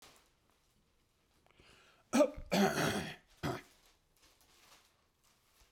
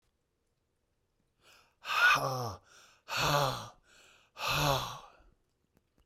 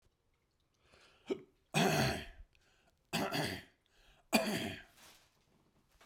cough_length: 5.7 s
cough_amplitude: 4398
cough_signal_mean_std_ratio: 0.32
exhalation_length: 6.1 s
exhalation_amplitude: 6481
exhalation_signal_mean_std_ratio: 0.42
three_cough_length: 6.1 s
three_cough_amplitude: 6400
three_cough_signal_mean_std_ratio: 0.4
survey_phase: beta (2021-08-13 to 2022-03-07)
age: 65+
gender: Male
wearing_mask: 'No'
symptom_cough_any: true
symptom_sore_throat: true
symptom_fatigue: true
smoker_status: Never smoked
respiratory_condition_asthma: false
respiratory_condition_other: false
recruitment_source: Test and Trace
submission_delay: 2 days
covid_test_result: Positive
covid_test_method: RT-qPCR
covid_ct_value: 32.0
covid_ct_gene: ORF1ab gene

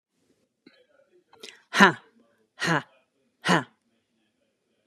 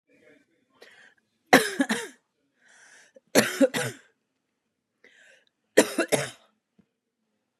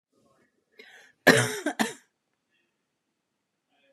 exhalation_length: 4.9 s
exhalation_amplitude: 32767
exhalation_signal_mean_std_ratio: 0.22
three_cough_length: 7.6 s
three_cough_amplitude: 32767
three_cough_signal_mean_std_ratio: 0.26
cough_length: 3.9 s
cough_amplitude: 26543
cough_signal_mean_std_ratio: 0.23
survey_phase: beta (2021-08-13 to 2022-03-07)
age: 18-44
gender: Female
wearing_mask: 'No'
symptom_cough_any: true
symptom_shortness_of_breath: true
symptom_sore_throat: true
symptom_fatigue: true
smoker_status: Never smoked
respiratory_condition_asthma: false
respiratory_condition_other: false
recruitment_source: Test and Trace
submission_delay: 2 days
covid_test_result: Positive
covid_test_method: LFT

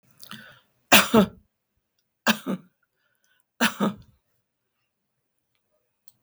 three_cough_length: 6.2 s
three_cough_amplitude: 32768
three_cough_signal_mean_std_ratio: 0.25
survey_phase: beta (2021-08-13 to 2022-03-07)
age: 65+
gender: Female
wearing_mask: 'No'
symptom_none: true
smoker_status: Never smoked
respiratory_condition_asthma: false
respiratory_condition_other: false
recruitment_source: REACT
submission_delay: 2 days
covid_test_result: Negative
covid_test_method: RT-qPCR
influenza_a_test_result: Negative
influenza_b_test_result: Negative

